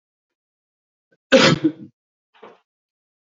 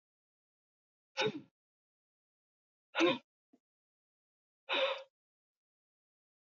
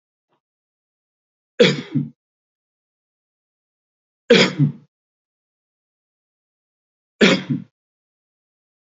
{"cough_length": "3.3 s", "cough_amplitude": 28121, "cough_signal_mean_std_ratio": 0.25, "exhalation_length": "6.5 s", "exhalation_amplitude": 4310, "exhalation_signal_mean_std_ratio": 0.25, "three_cough_length": "8.9 s", "three_cough_amplitude": 28925, "three_cough_signal_mean_std_ratio": 0.24, "survey_phase": "beta (2021-08-13 to 2022-03-07)", "age": "45-64", "gender": "Male", "wearing_mask": "No", "symptom_cough_any": true, "smoker_status": "Ex-smoker", "respiratory_condition_asthma": false, "respiratory_condition_other": false, "recruitment_source": "Test and Trace", "submission_delay": "0 days", "covid_test_result": "Negative", "covid_test_method": "LFT"}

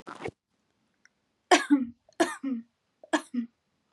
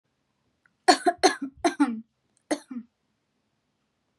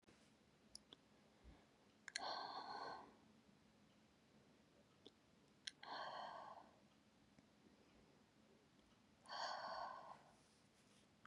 {"three_cough_length": "3.9 s", "three_cough_amplitude": 19110, "three_cough_signal_mean_std_ratio": 0.32, "cough_length": "4.2 s", "cough_amplitude": 26253, "cough_signal_mean_std_ratio": 0.29, "exhalation_length": "11.3 s", "exhalation_amplitude": 1305, "exhalation_signal_mean_std_ratio": 0.51, "survey_phase": "beta (2021-08-13 to 2022-03-07)", "age": "18-44", "gender": "Female", "wearing_mask": "No", "symptom_none": true, "smoker_status": "Never smoked", "respiratory_condition_asthma": true, "respiratory_condition_other": false, "recruitment_source": "REACT", "submission_delay": "1 day", "covid_test_result": "Negative", "covid_test_method": "RT-qPCR", "influenza_a_test_result": "Negative", "influenza_b_test_result": "Negative"}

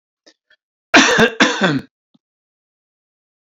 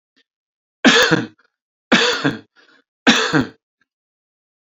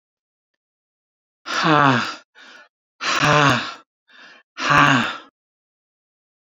{"cough_length": "3.4 s", "cough_amplitude": 32767, "cough_signal_mean_std_ratio": 0.36, "three_cough_length": "4.7 s", "three_cough_amplitude": 32261, "three_cough_signal_mean_std_ratio": 0.38, "exhalation_length": "6.5 s", "exhalation_amplitude": 28255, "exhalation_signal_mean_std_ratio": 0.41, "survey_phase": "beta (2021-08-13 to 2022-03-07)", "age": "65+", "gender": "Male", "wearing_mask": "No", "symptom_none": true, "smoker_status": "Never smoked", "respiratory_condition_asthma": false, "respiratory_condition_other": false, "recruitment_source": "REACT", "submission_delay": "2 days", "covid_test_result": "Negative", "covid_test_method": "RT-qPCR"}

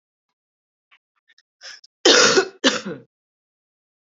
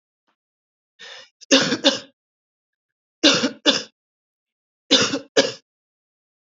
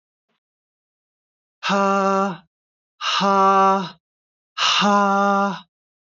{"cough_length": "4.2 s", "cough_amplitude": 31403, "cough_signal_mean_std_ratio": 0.3, "three_cough_length": "6.6 s", "three_cough_amplitude": 32767, "three_cough_signal_mean_std_ratio": 0.32, "exhalation_length": "6.1 s", "exhalation_amplitude": 19403, "exhalation_signal_mean_std_ratio": 0.53, "survey_phase": "beta (2021-08-13 to 2022-03-07)", "age": "18-44", "gender": "Female", "wearing_mask": "No", "symptom_cough_any": true, "symptom_runny_or_blocked_nose": true, "symptom_fatigue": true, "symptom_headache": true, "symptom_change_to_sense_of_smell_or_taste": true, "symptom_loss_of_taste": true, "smoker_status": "Ex-smoker", "respiratory_condition_asthma": true, "respiratory_condition_other": false, "recruitment_source": "Test and Trace", "submission_delay": "1 day", "covid_test_result": "Positive", "covid_test_method": "RT-qPCR", "covid_ct_value": 27.2, "covid_ct_gene": "ORF1ab gene", "covid_ct_mean": 28.0, "covid_viral_load": "660 copies/ml", "covid_viral_load_category": "Minimal viral load (< 10K copies/ml)"}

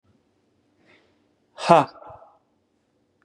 {"exhalation_length": "3.2 s", "exhalation_amplitude": 32485, "exhalation_signal_mean_std_ratio": 0.19, "survey_phase": "beta (2021-08-13 to 2022-03-07)", "age": "18-44", "gender": "Male", "wearing_mask": "No", "symptom_none": true, "smoker_status": "Never smoked", "respiratory_condition_asthma": false, "respiratory_condition_other": false, "recruitment_source": "REACT", "submission_delay": "1 day", "covid_test_result": "Negative", "covid_test_method": "RT-qPCR", "influenza_a_test_result": "Negative", "influenza_b_test_result": "Negative"}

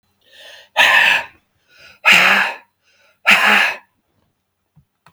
{"exhalation_length": "5.1 s", "exhalation_amplitude": 32768, "exhalation_signal_mean_std_ratio": 0.44, "survey_phase": "beta (2021-08-13 to 2022-03-07)", "age": "65+", "gender": "Male", "wearing_mask": "No", "symptom_cough_any": true, "symptom_new_continuous_cough": true, "symptom_runny_or_blocked_nose": true, "symptom_onset": "4 days", "smoker_status": "Never smoked", "respiratory_condition_asthma": false, "respiratory_condition_other": false, "recruitment_source": "Test and Trace", "submission_delay": "1 day", "covid_test_result": "Negative", "covid_test_method": "ePCR"}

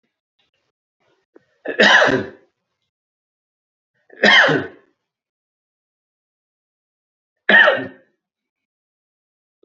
{"three_cough_length": "9.6 s", "three_cough_amplitude": 30391, "three_cough_signal_mean_std_ratio": 0.28, "survey_phase": "beta (2021-08-13 to 2022-03-07)", "age": "45-64", "gender": "Male", "wearing_mask": "No", "symptom_none": true, "smoker_status": "Ex-smoker", "respiratory_condition_asthma": false, "respiratory_condition_other": false, "recruitment_source": "REACT", "submission_delay": "5 days", "covid_test_result": "Negative", "covid_test_method": "RT-qPCR"}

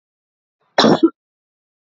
{"cough_length": "1.9 s", "cough_amplitude": 28696, "cough_signal_mean_std_ratio": 0.3, "survey_phase": "alpha (2021-03-01 to 2021-08-12)", "age": "18-44", "gender": "Female", "wearing_mask": "No", "symptom_none": true, "smoker_status": "Never smoked", "respiratory_condition_asthma": false, "respiratory_condition_other": false, "recruitment_source": "REACT", "submission_delay": "3 days", "covid_test_result": "Negative", "covid_test_method": "RT-qPCR"}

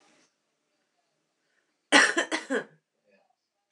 {"cough_length": "3.7 s", "cough_amplitude": 19847, "cough_signal_mean_std_ratio": 0.26, "survey_phase": "beta (2021-08-13 to 2022-03-07)", "age": "45-64", "gender": "Female", "wearing_mask": "No", "symptom_none": true, "smoker_status": "Current smoker (1 to 10 cigarettes per day)", "respiratory_condition_asthma": false, "respiratory_condition_other": false, "recruitment_source": "REACT", "submission_delay": "2 days", "covid_test_result": "Negative", "covid_test_method": "RT-qPCR", "influenza_a_test_result": "Negative", "influenza_b_test_result": "Negative"}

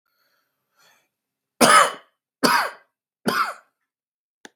{"three_cough_length": "4.6 s", "three_cough_amplitude": 32767, "three_cough_signal_mean_std_ratio": 0.31, "survey_phase": "beta (2021-08-13 to 2022-03-07)", "age": "45-64", "gender": "Male", "wearing_mask": "No", "symptom_fatigue": true, "symptom_headache": true, "symptom_change_to_sense_of_smell_or_taste": true, "symptom_onset": "6 days", "smoker_status": "Never smoked", "respiratory_condition_asthma": false, "respiratory_condition_other": false, "recruitment_source": "Test and Trace", "submission_delay": "2 days", "covid_test_result": "Positive", "covid_test_method": "RT-qPCR"}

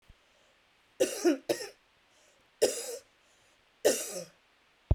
{"three_cough_length": "4.9 s", "three_cough_amplitude": 8816, "three_cough_signal_mean_std_ratio": 0.33, "survey_phase": "beta (2021-08-13 to 2022-03-07)", "age": "45-64", "gender": "Female", "wearing_mask": "No", "symptom_runny_or_blocked_nose": true, "symptom_abdominal_pain": true, "symptom_diarrhoea": true, "symptom_fatigue": true, "symptom_onset": "12 days", "smoker_status": "Ex-smoker", "respiratory_condition_asthma": true, "respiratory_condition_other": false, "recruitment_source": "REACT", "submission_delay": "1 day", "covid_test_result": "Negative", "covid_test_method": "RT-qPCR", "influenza_a_test_result": "Negative", "influenza_b_test_result": "Negative"}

